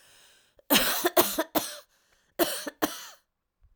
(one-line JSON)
{"cough_length": "3.8 s", "cough_amplitude": 20550, "cough_signal_mean_std_ratio": 0.41, "survey_phase": "alpha (2021-03-01 to 2021-08-12)", "age": "18-44", "gender": "Female", "wearing_mask": "No", "symptom_none": true, "smoker_status": "Never smoked", "respiratory_condition_asthma": false, "respiratory_condition_other": false, "recruitment_source": "REACT", "submission_delay": "3 days", "covid_test_result": "Negative", "covid_test_method": "RT-qPCR"}